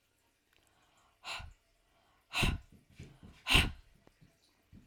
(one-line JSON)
{"exhalation_length": "4.9 s", "exhalation_amplitude": 8324, "exhalation_signal_mean_std_ratio": 0.28, "survey_phase": "alpha (2021-03-01 to 2021-08-12)", "age": "45-64", "gender": "Female", "wearing_mask": "No", "symptom_none": true, "smoker_status": "Never smoked", "respiratory_condition_asthma": false, "respiratory_condition_other": false, "recruitment_source": "REACT", "submission_delay": "1 day", "covid_test_result": "Negative", "covid_test_method": "RT-qPCR"}